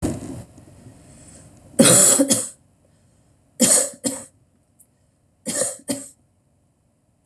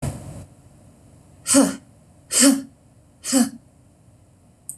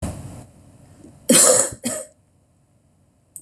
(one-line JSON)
{"three_cough_length": "7.3 s", "three_cough_amplitude": 26028, "three_cough_signal_mean_std_ratio": 0.36, "exhalation_length": "4.8 s", "exhalation_amplitude": 25343, "exhalation_signal_mean_std_ratio": 0.37, "cough_length": "3.4 s", "cough_amplitude": 26028, "cough_signal_mean_std_ratio": 0.35, "survey_phase": "beta (2021-08-13 to 2022-03-07)", "age": "45-64", "gender": "Female", "wearing_mask": "No", "symptom_none": true, "smoker_status": "Never smoked", "respiratory_condition_asthma": false, "respiratory_condition_other": false, "recruitment_source": "REACT", "submission_delay": "1 day", "covid_test_result": "Negative", "covid_test_method": "RT-qPCR", "influenza_a_test_result": "Negative", "influenza_b_test_result": "Negative"}